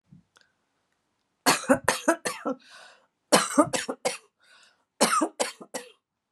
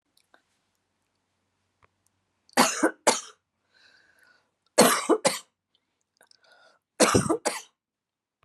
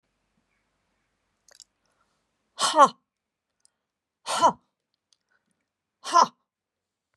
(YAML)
cough_length: 6.3 s
cough_amplitude: 26831
cough_signal_mean_std_ratio: 0.36
three_cough_length: 8.4 s
three_cough_amplitude: 25328
three_cough_signal_mean_std_ratio: 0.29
exhalation_length: 7.2 s
exhalation_amplitude: 21453
exhalation_signal_mean_std_ratio: 0.21
survey_phase: beta (2021-08-13 to 2022-03-07)
age: 45-64
gender: Female
wearing_mask: 'No'
symptom_cough_any: true
smoker_status: Never smoked
respiratory_condition_asthma: false
respiratory_condition_other: false
recruitment_source: REACT
submission_delay: 2 days
covid_test_result: Negative
covid_test_method: RT-qPCR